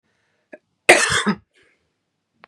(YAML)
cough_length: 2.5 s
cough_amplitude: 32768
cough_signal_mean_std_ratio: 0.29
survey_phase: beta (2021-08-13 to 2022-03-07)
age: 18-44
gender: Female
wearing_mask: 'No'
symptom_none: true
smoker_status: Never smoked
respiratory_condition_asthma: false
respiratory_condition_other: false
recruitment_source: REACT
submission_delay: 1 day
covid_test_result: Negative
covid_test_method: RT-qPCR
influenza_a_test_result: Negative
influenza_b_test_result: Negative